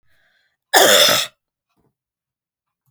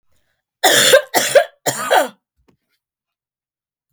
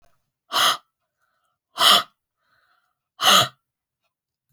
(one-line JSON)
{"cough_length": "2.9 s", "cough_amplitude": 32768, "cough_signal_mean_std_ratio": 0.34, "three_cough_length": "3.9 s", "three_cough_amplitude": 32768, "three_cough_signal_mean_std_ratio": 0.39, "exhalation_length": "4.5 s", "exhalation_amplitude": 32768, "exhalation_signal_mean_std_ratio": 0.31, "survey_phase": "beta (2021-08-13 to 2022-03-07)", "age": "45-64", "gender": "Female", "wearing_mask": "No", "symptom_none": true, "smoker_status": "Never smoked", "respiratory_condition_asthma": false, "respiratory_condition_other": false, "recruitment_source": "REACT", "submission_delay": "1 day", "covid_test_result": "Negative", "covid_test_method": "RT-qPCR"}